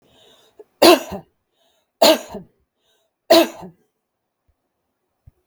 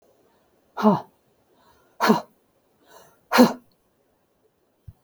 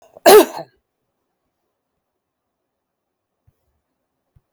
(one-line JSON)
{"three_cough_length": "5.5 s", "three_cough_amplitude": 32766, "three_cough_signal_mean_std_ratio": 0.26, "exhalation_length": "5.0 s", "exhalation_amplitude": 32766, "exhalation_signal_mean_std_ratio": 0.26, "cough_length": "4.5 s", "cough_amplitude": 32768, "cough_signal_mean_std_ratio": 0.18, "survey_phase": "beta (2021-08-13 to 2022-03-07)", "age": "45-64", "gender": "Female", "wearing_mask": "No", "symptom_none": true, "smoker_status": "Never smoked", "respiratory_condition_asthma": false, "respiratory_condition_other": false, "recruitment_source": "Test and Trace", "submission_delay": "1 day", "covid_test_result": "Negative", "covid_test_method": "ePCR"}